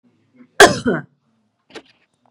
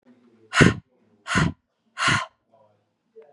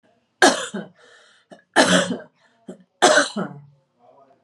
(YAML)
cough_length: 2.3 s
cough_amplitude: 32768
cough_signal_mean_std_ratio: 0.25
exhalation_length: 3.3 s
exhalation_amplitude: 32571
exhalation_signal_mean_std_ratio: 0.33
three_cough_length: 4.4 s
three_cough_amplitude: 31915
three_cough_signal_mean_std_ratio: 0.37
survey_phase: beta (2021-08-13 to 2022-03-07)
age: 45-64
gender: Female
wearing_mask: 'No'
symptom_none: true
smoker_status: Never smoked
respiratory_condition_asthma: false
respiratory_condition_other: false
recruitment_source: Test and Trace
submission_delay: 1 day
covid_test_result: Negative
covid_test_method: RT-qPCR